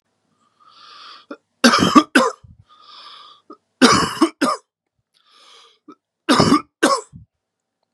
{
  "three_cough_length": "7.9 s",
  "three_cough_amplitude": 32768,
  "three_cough_signal_mean_std_ratio": 0.35,
  "survey_phase": "beta (2021-08-13 to 2022-03-07)",
  "age": "18-44",
  "gender": "Male",
  "wearing_mask": "No",
  "symptom_cough_any": true,
  "symptom_new_continuous_cough": true,
  "symptom_sore_throat": true,
  "symptom_fatigue": true,
  "symptom_change_to_sense_of_smell_or_taste": true,
  "symptom_onset": "5 days",
  "smoker_status": "Ex-smoker",
  "respiratory_condition_asthma": false,
  "respiratory_condition_other": false,
  "recruitment_source": "Test and Trace",
  "submission_delay": "2 days",
  "covid_test_result": "Positive",
  "covid_test_method": "RT-qPCR",
  "covid_ct_value": 18.2,
  "covid_ct_gene": "ORF1ab gene",
  "covid_ct_mean": 18.5,
  "covid_viral_load": "850000 copies/ml",
  "covid_viral_load_category": "Low viral load (10K-1M copies/ml)"
}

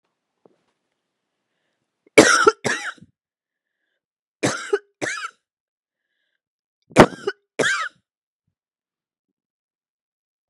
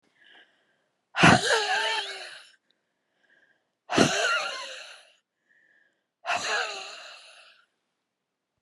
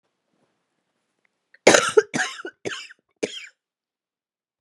{
  "three_cough_length": "10.5 s",
  "three_cough_amplitude": 32768,
  "three_cough_signal_mean_std_ratio": 0.23,
  "exhalation_length": "8.6 s",
  "exhalation_amplitude": 23285,
  "exhalation_signal_mean_std_ratio": 0.37,
  "cough_length": "4.6 s",
  "cough_amplitude": 32767,
  "cough_signal_mean_std_ratio": 0.24,
  "survey_phase": "beta (2021-08-13 to 2022-03-07)",
  "age": "45-64",
  "gender": "Female",
  "wearing_mask": "No",
  "symptom_cough_any": true,
  "symptom_shortness_of_breath": true,
  "symptom_fatigue": true,
  "symptom_change_to_sense_of_smell_or_taste": true,
  "symptom_onset": "12 days",
  "smoker_status": "Never smoked",
  "respiratory_condition_asthma": false,
  "respiratory_condition_other": false,
  "recruitment_source": "REACT",
  "submission_delay": "2 days",
  "covid_test_result": "Negative",
  "covid_test_method": "RT-qPCR"
}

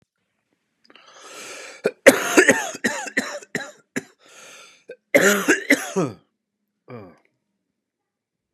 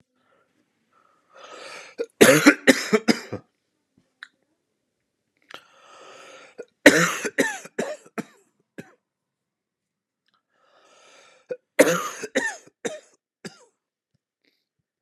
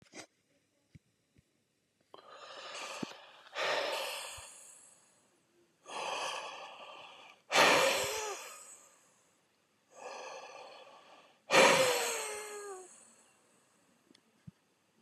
{
  "cough_length": "8.5 s",
  "cough_amplitude": 32768,
  "cough_signal_mean_std_ratio": 0.33,
  "three_cough_length": "15.0 s",
  "three_cough_amplitude": 32768,
  "three_cough_signal_mean_std_ratio": 0.25,
  "exhalation_length": "15.0 s",
  "exhalation_amplitude": 9289,
  "exhalation_signal_mean_std_ratio": 0.37,
  "survey_phase": "beta (2021-08-13 to 2022-03-07)",
  "age": "45-64",
  "gender": "Male",
  "wearing_mask": "No",
  "symptom_cough_any": true,
  "symptom_fatigue": true,
  "symptom_fever_high_temperature": true,
  "symptom_headache": true,
  "symptom_change_to_sense_of_smell_or_taste": true,
  "symptom_onset": "3 days",
  "smoker_status": "Ex-smoker",
  "respiratory_condition_asthma": false,
  "respiratory_condition_other": false,
  "recruitment_source": "Test and Trace",
  "submission_delay": "2 days",
  "covid_test_result": "Positive",
  "covid_test_method": "RT-qPCR"
}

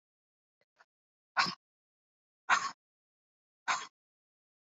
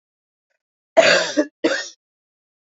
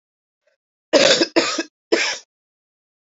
{
  "exhalation_length": "4.6 s",
  "exhalation_amplitude": 6539,
  "exhalation_signal_mean_std_ratio": 0.24,
  "cough_length": "2.7 s",
  "cough_amplitude": 27219,
  "cough_signal_mean_std_ratio": 0.35,
  "three_cough_length": "3.1 s",
  "three_cough_amplitude": 31616,
  "three_cough_signal_mean_std_ratio": 0.39,
  "survey_phase": "beta (2021-08-13 to 2022-03-07)",
  "age": "45-64",
  "gender": "Female",
  "wearing_mask": "No",
  "symptom_cough_any": true,
  "symptom_runny_or_blocked_nose": true,
  "symptom_shortness_of_breath": true,
  "symptom_sore_throat": true,
  "symptom_fatigue": true,
  "symptom_change_to_sense_of_smell_or_taste": true,
  "smoker_status": "Never smoked",
  "respiratory_condition_asthma": false,
  "respiratory_condition_other": false,
  "recruitment_source": "Test and Trace",
  "submission_delay": "2 days",
  "covid_test_result": "Positive",
  "covid_test_method": "RT-qPCR",
  "covid_ct_value": 22.1,
  "covid_ct_gene": "ORF1ab gene",
  "covid_ct_mean": 22.6,
  "covid_viral_load": "40000 copies/ml",
  "covid_viral_load_category": "Low viral load (10K-1M copies/ml)"
}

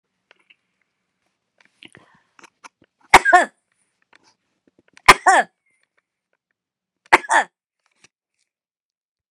{
  "three_cough_length": "9.3 s",
  "three_cough_amplitude": 32768,
  "three_cough_signal_mean_std_ratio": 0.19,
  "survey_phase": "beta (2021-08-13 to 2022-03-07)",
  "age": "65+",
  "gender": "Female",
  "wearing_mask": "No",
  "symptom_shortness_of_breath": true,
  "smoker_status": "Ex-smoker",
  "respiratory_condition_asthma": true,
  "respiratory_condition_other": true,
  "recruitment_source": "REACT",
  "submission_delay": "1 day",
  "covid_test_result": "Negative",
  "covid_test_method": "RT-qPCR"
}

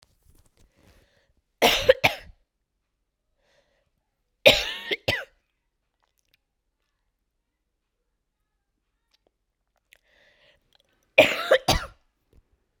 {
  "three_cough_length": "12.8 s",
  "three_cough_amplitude": 32767,
  "three_cough_signal_mean_std_ratio": 0.22,
  "survey_phase": "beta (2021-08-13 to 2022-03-07)",
  "age": "18-44",
  "gender": "Female",
  "wearing_mask": "No",
  "symptom_cough_any": true,
  "symptom_runny_or_blocked_nose": true,
  "symptom_sore_throat": true,
  "symptom_abdominal_pain": true,
  "symptom_diarrhoea": true,
  "symptom_fatigue": true,
  "symptom_fever_high_temperature": true,
  "symptom_headache": true,
  "symptom_onset": "4 days",
  "smoker_status": "Never smoked",
  "respiratory_condition_asthma": false,
  "respiratory_condition_other": false,
  "recruitment_source": "Test and Trace",
  "submission_delay": "3 days",
  "covid_test_result": "Positive",
  "covid_test_method": "ePCR"
}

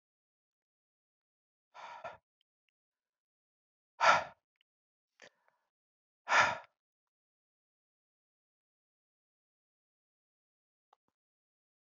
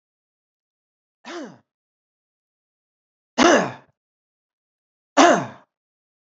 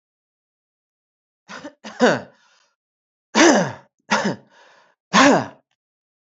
{
  "exhalation_length": "11.9 s",
  "exhalation_amplitude": 8031,
  "exhalation_signal_mean_std_ratio": 0.16,
  "three_cough_length": "6.4 s",
  "three_cough_amplitude": 27452,
  "three_cough_signal_mean_std_ratio": 0.23,
  "cough_length": "6.3 s",
  "cough_amplitude": 29806,
  "cough_signal_mean_std_ratio": 0.32,
  "survey_phase": "beta (2021-08-13 to 2022-03-07)",
  "age": "45-64",
  "gender": "Male",
  "wearing_mask": "No",
  "symptom_none": true,
  "symptom_onset": "12 days",
  "smoker_status": "Never smoked",
  "respiratory_condition_asthma": false,
  "respiratory_condition_other": false,
  "recruitment_source": "REACT",
  "submission_delay": "1 day",
  "covid_test_result": "Negative",
  "covid_test_method": "RT-qPCR",
  "influenza_a_test_result": "Negative",
  "influenza_b_test_result": "Negative"
}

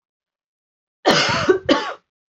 {
  "cough_length": "2.4 s",
  "cough_amplitude": 28109,
  "cough_signal_mean_std_ratio": 0.44,
  "survey_phase": "alpha (2021-03-01 to 2021-08-12)",
  "age": "18-44",
  "gender": "Female",
  "wearing_mask": "No",
  "symptom_cough_any": true,
  "symptom_shortness_of_breath": true,
  "symptom_abdominal_pain": true,
  "symptom_fatigue": true,
  "symptom_onset": "3 days",
  "smoker_status": "Never smoked",
  "respiratory_condition_asthma": false,
  "respiratory_condition_other": false,
  "recruitment_source": "Test and Trace",
  "submission_delay": "2 days",
  "covid_test_result": "Positive",
  "covid_test_method": "RT-qPCR"
}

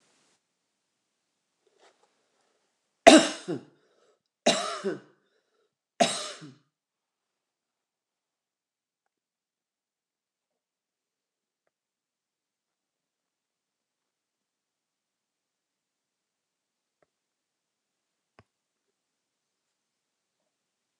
{
  "three_cough_length": "21.0 s",
  "three_cough_amplitude": 29204,
  "three_cough_signal_mean_std_ratio": 0.12,
  "survey_phase": "alpha (2021-03-01 to 2021-08-12)",
  "age": "65+",
  "gender": "Female",
  "wearing_mask": "No",
  "symptom_diarrhoea": true,
  "smoker_status": "Ex-smoker",
  "respiratory_condition_asthma": false,
  "respiratory_condition_other": false,
  "recruitment_source": "REACT",
  "submission_delay": "2 days",
  "covid_test_result": "Negative",
  "covid_test_method": "RT-qPCR"
}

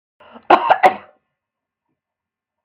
{
  "cough_length": "2.6 s",
  "cough_amplitude": 32768,
  "cough_signal_mean_std_ratio": 0.27,
  "survey_phase": "beta (2021-08-13 to 2022-03-07)",
  "age": "65+",
  "gender": "Female",
  "wearing_mask": "No",
  "symptom_runny_or_blocked_nose": true,
  "smoker_status": "Never smoked",
  "respiratory_condition_asthma": false,
  "respiratory_condition_other": false,
  "recruitment_source": "REACT",
  "submission_delay": "1 day",
  "covid_test_result": "Negative",
  "covid_test_method": "RT-qPCR",
  "influenza_a_test_result": "Negative",
  "influenza_b_test_result": "Negative"
}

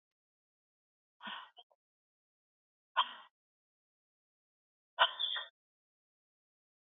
{
  "exhalation_length": "7.0 s",
  "exhalation_amplitude": 6434,
  "exhalation_signal_mean_std_ratio": 0.19,
  "survey_phase": "beta (2021-08-13 to 2022-03-07)",
  "age": "18-44",
  "gender": "Female",
  "wearing_mask": "No",
  "symptom_abdominal_pain": true,
  "symptom_fatigue": true,
  "smoker_status": "Never smoked",
  "respiratory_condition_asthma": false,
  "respiratory_condition_other": false,
  "recruitment_source": "REACT",
  "submission_delay": "4 days",
  "covid_test_result": "Negative",
  "covid_test_method": "RT-qPCR"
}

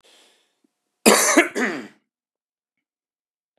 {
  "cough_length": "3.6 s",
  "cough_amplitude": 32768,
  "cough_signal_mean_std_ratio": 0.31,
  "survey_phase": "beta (2021-08-13 to 2022-03-07)",
  "age": "45-64",
  "gender": "Male",
  "wearing_mask": "No",
  "symptom_cough_any": true,
  "symptom_runny_or_blocked_nose": true,
  "symptom_fatigue": true,
  "symptom_headache": true,
  "symptom_onset": "3 days",
  "smoker_status": "Current smoker (e-cigarettes or vapes only)",
  "respiratory_condition_asthma": false,
  "respiratory_condition_other": false,
  "recruitment_source": "Test and Trace",
  "submission_delay": "2 days",
  "covid_test_result": "Positive",
  "covid_test_method": "RT-qPCR",
  "covid_ct_value": 15.7,
  "covid_ct_gene": "ORF1ab gene",
  "covid_ct_mean": 16.2,
  "covid_viral_load": "5000000 copies/ml",
  "covid_viral_load_category": "High viral load (>1M copies/ml)"
}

